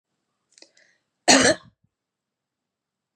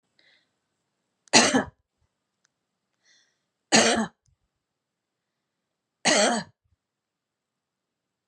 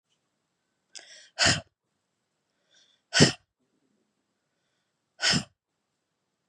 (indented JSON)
{
  "cough_length": "3.2 s",
  "cough_amplitude": 32598,
  "cough_signal_mean_std_ratio": 0.23,
  "three_cough_length": "8.3 s",
  "three_cough_amplitude": 29057,
  "three_cough_signal_mean_std_ratio": 0.26,
  "exhalation_length": "6.5 s",
  "exhalation_amplitude": 23863,
  "exhalation_signal_mean_std_ratio": 0.22,
  "survey_phase": "beta (2021-08-13 to 2022-03-07)",
  "age": "45-64",
  "gender": "Female",
  "wearing_mask": "No",
  "symptom_none": true,
  "smoker_status": "Never smoked",
  "respiratory_condition_asthma": false,
  "respiratory_condition_other": false,
  "recruitment_source": "REACT",
  "submission_delay": "2 days",
  "covid_test_result": "Negative",
  "covid_test_method": "RT-qPCR",
  "influenza_a_test_result": "Negative",
  "influenza_b_test_result": "Negative"
}